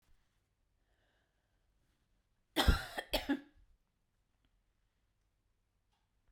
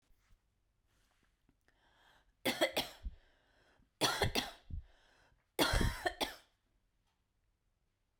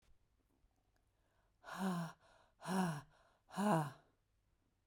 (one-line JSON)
{"cough_length": "6.3 s", "cough_amplitude": 5119, "cough_signal_mean_std_ratio": 0.21, "three_cough_length": "8.2 s", "three_cough_amplitude": 4499, "three_cough_signal_mean_std_ratio": 0.34, "exhalation_length": "4.9 s", "exhalation_amplitude": 2320, "exhalation_signal_mean_std_ratio": 0.4, "survey_phase": "beta (2021-08-13 to 2022-03-07)", "age": "18-44", "gender": "Female", "wearing_mask": "No", "symptom_sore_throat": true, "symptom_headache": true, "smoker_status": "Never smoked", "respiratory_condition_asthma": false, "respiratory_condition_other": false, "recruitment_source": "Test and Trace", "submission_delay": "1 day", "covid_test_result": "Positive", "covid_test_method": "ePCR"}